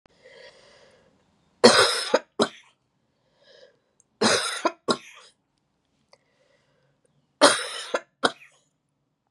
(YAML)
three_cough_length: 9.3 s
three_cough_amplitude: 31618
three_cough_signal_mean_std_ratio: 0.28
survey_phase: beta (2021-08-13 to 2022-03-07)
age: 45-64
gender: Female
wearing_mask: 'No'
symptom_cough_any: true
symptom_runny_or_blocked_nose: true
smoker_status: Never smoked
respiratory_condition_asthma: false
respiratory_condition_other: false
recruitment_source: Test and Trace
submission_delay: 2 days
covid_test_result: Positive
covid_test_method: LFT